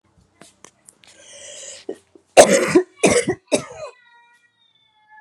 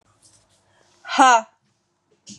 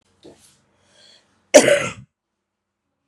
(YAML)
three_cough_length: 5.2 s
three_cough_amplitude: 32768
three_cough_signal_mean_std_ratio: 0.3
exhalation_length: 2.4 s
exhalation_amplitude: 29236
exhalation_signal_mean_std_ratio: 0.28
cough_length: 3.1 s
cough_amplitude: 32768
cough_signal_mean_std_ratio: 0.23
survey_phase: beta (2021-08-13 to 2022-03-07)
age: 18-44
gender: Female
wearing_mask: 'No'
symptom_runny_or_blocked_nose: true
symptom_fatigue: true
symptom_fever_high_temperature: true
smoker_status: Ex-smoker
respiratory_condition_asthma: false
respiratory_condition_other: false
recruitment_source: Test and Trace
submission_delay: 3 days
covid_test_result: Positive
covid_test_method: ePCR